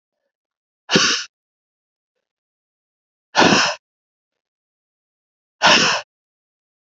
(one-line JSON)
{"exhalation_length": "6.9 s", "exhalation_amplitude": 32768, "exhalation_signal_mean_std_ratio": 0.3, "survey_phase": "beta (2021-08-13 to 2022-03-07)", "age": "45-64", "gender": "Female", "wearing_mask": "No", "symptom_cough_any": true, "symptom_runny_or_blocked_nose": true, "symptom_change_to_sense_of_smell_or_taste": true, "symptom_onset": "2 days", "smoker_status": "Never smoked", "respiratory_condition_asthma": false, "respiratory_condition_other": false, "recruitment_source": "Test and Trace", "submission_delay": "2 days", "covid_test_result": "Positive", "covid_test_method": "RT-qPCR"}